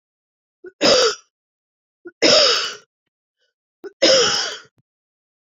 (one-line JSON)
{"three_cough_length": "5.5 s", "three_cough_amplitude": 30891, "three_cough_signal_mean_std_ratio": 0.4, "survey_phase": "beta (2021-08-13 to 2022-03-07)", "age": "45-64", "gender": "Female", "wearing_mask": "No", "symptom_cough_any": true, "symptom_runny_or_blocked_nose": true, "symptom_shortness_of_breath": true, "symptom_sore_throat": true, "symptom_diarrhoea": true, "symptom_fatigue": true, "symptom_fever_high_temperature": true, "symptom_headache": true, "smoker_status": "Never smoked", "respiratory_condition_asthma": true, "respiratory_condition_other": false, "recruitment_source": "Test and Trace", "submission_delay": "2 days", "covid_test_result": "Positive", "covid_test_method": "LFT"}